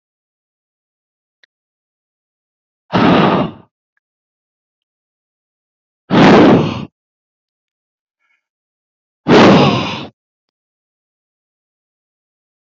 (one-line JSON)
{"exhalation_length": "12.6 s", "exhalation_amplitude": 30613, "exhalation_signal_mean_std_ratio": 0.32, "survey_phase": "beta (2021-08-13 to 2022-03-07)", "age": "45-64", "gender": "Male", "wearing_mask": "No", "symptom_none": true, "smoker_status": "Ex-smoker", "respiratory_condition_asthma": false, "respiratory_condition_other": false, "recruitment_source": "REACT", "submission_delay": "6 days", "covid_test_result": "Negative", "covid_test_method": "RT-qPCR"}